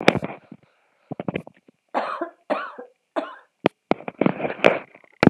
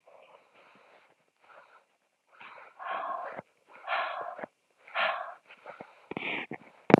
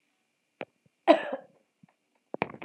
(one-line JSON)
{"three_cough_length": "5.3 s", "three_cough_amplitude": 32768, "three_cough_signal_mean_std_ratio": 0.29, "exhalation_length": "7.0 s", "exhalation_amplitude": 32768, "exhalation_signal_mean_std_ratio": 0.29, "cough_length": "2.6 s", "cough_amplitude": 20414, "cough_signal_mean_std_ratio": 0.21, "survey_phase": "beta (2021-08-13 to 2022-03-07)", "age": "45-64", "gender": "Female", "wearing_mask": "No", "symptom_cough_any": true, "symptom_other": true, "smoker_status": "Never smoked", "respiratory_condition_asthma": false, "respiratory_condition_other": false, "recruitment_source": "Test and Trace", "submission_delay": "2 days", "covid_test_result": "Positive", "covid_test_method": "RT-qPCR"}